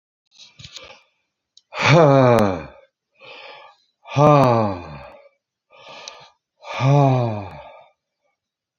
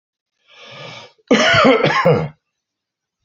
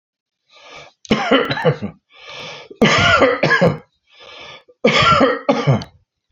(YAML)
exhalation_length: 8.8 s
exhalation_amplitude: 30251
exhalation_signal_mean_std_ratio: 0.4
cough_length: 3.2 s
cough_amplitude: 32027
cough_signal_mean_std_ratio: 0.48
three_cough_length: 6.3 s
three_cough_amplitude: 28231
three_cough_signal_mean_std_ratio: 0.55
survey_phase: beta (2021-08-13 to 2022-03-07)
age: 65+
gender: Male
wearing_mask: 'No'
symptom_none: true
smoker_status: Ex-smoker
respiratory_condition_asthma: false
respiratory_condition_other: false
recruitment_source: REACT
submission_delay: 1 day
covid_test_result: Negative
covid_test_method: RT-qPCR
influenza_a_test_result: Negative
influenza_b_test_result: Negative